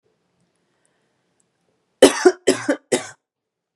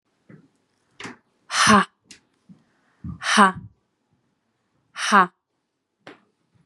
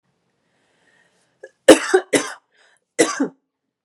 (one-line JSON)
{"three_cough_length": "3.8 s", "three_cough_amplitude": 32768, "three_cough_signal_mean_std_ratio": 0.25, "exhalation_length": "6.7 s", "exhalation_amplitude": 29876, "exhalation_signal_mean_std_ratio": 0.28, "cough_length": "3.8 s", "cough_amplitude": 32768, "cough_signal_mean_std_ratio": 0.26, "survey_phase": "beta (2021-08-13 to 2022-03-07)", "age": "18-44", "gender": "Female", "wearing_mask": "No", "symptom_cough_any": true, "symptom_runny_or_blocked_nose": true, "symptom_fatigue": true, "symptom_headache": true, "symptom_onset": "7 days", "smoker_status": "Ex-smoker", "respiratory_condition_asthma": false, "respiratory_condition_other": false, "recruitment_source": "Test and Trace", "submission_delay": "2 days", "covid_test_result": "Positive", "covid_test_method": "RT-qPCR", "covid_ct_value": 20.3, "covid_ct_gene": "ORF1ab gene", "covid_ct_mean": 20.8, "covid_viral_load": "150000 copies/ml", "covid_viral_load_category": "Low viral load (10K-1M copies/ml)"}